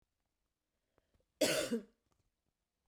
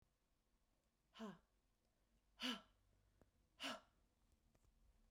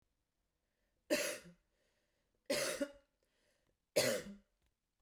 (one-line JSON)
{"cough_length": "2.9 s", "cough_amplitude": 3708, "cough_signal_mean_std_ratio": 0.29, "exhalation_length": "5.1 s", "exhalation_amplitude": 732, "exhalation_signal_mean_std_ratio": 0.31, "three_cough_length": "5.0 s", "three_cough_amplitude": 3079, "three_cough_signal_mean_std_ratio": 0.34, "survey_phase": "beta (2021-08-13 to 2022-03-07)", "age": "45-64", "gender": "Female", "wearing_mask": "No", "symptom_cough_any": true, "symptom_runny_or_blocked_nose": true, "symptom_sore_throat": true, "symptom_fatigue": true, "symptom_headache": true, "symptom_onset": "2 days", "smoker_status": "Never smoked", "respiratory_condition_asthma": false, "respiratory_condition_other": false, "recruitment_source": "Test and Trace", "submission_delay": "1 day", "covid_test_result": "Positive", "covid_test_method": "ePCR"}